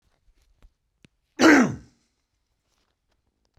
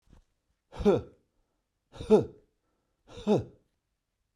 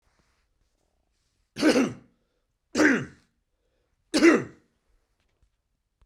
cough_length: 3.6 s
cough_amplitude: 25297
cough_signal_mean_std_ratio: 0.24
exhalation_length: 4.4 s
exhalation_amplitude: 10992
exhalation_signal_mean_std_ratio: 0.28
three_cough_length: 6.1 s
three_cough_amplitude: 17995
three_cough_signal_mean_std_ratio: 0.3
survey_phase: beta (2021-08-13 to 2022-03-07)
age: 45-64
gender: Male
wearing_mask: 'No'
symptom_none: true
smoker_status: Ex-smoker
respiratory_condition_asthma: false
respiratory_condition_other: false
recruitment_source: REACT
submission_delay: 3 days
covid_test_result: Negative
covid_test_method: RT-qPCR
influenza_a_test_result: Negative
influenza_b_test_result: Negative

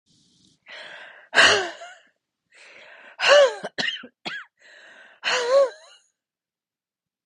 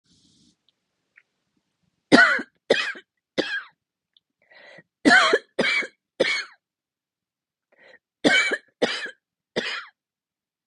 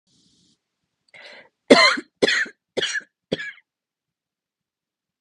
exhalation_length: 7.3 s
exhalation_amplitude: 24776
exhalation_signal_mean_std_ratio: 0.35
three_cough_length: 10.7 s
three_cough_amplitude: 29510
three_cough_signal_mean_std_ratio: 0.33
cough_length: 5.2 s
cough_amplitude: 32768
cough_signal_mean_std_ratio: 0.27
survey_phase: beta (2021-08-13 to 2022-03-07)
age: 45-64
gender: Female
wearing_mask: 'No'
symptom_cough_any: true
symptom_sore_throat: true
symptom_fatigue: true
symptom_onset: 8 days
smoker_status: Never smoked
respiratory_condition_asthma: false
respiratory_condition_other: false
recruitment_source: REACT
submission_delay: 2 days
covid_test_result: Negative
covid_test_method: RT-qPCR
influenza_a_test_result: Negative
influenza_b_test_result: Negative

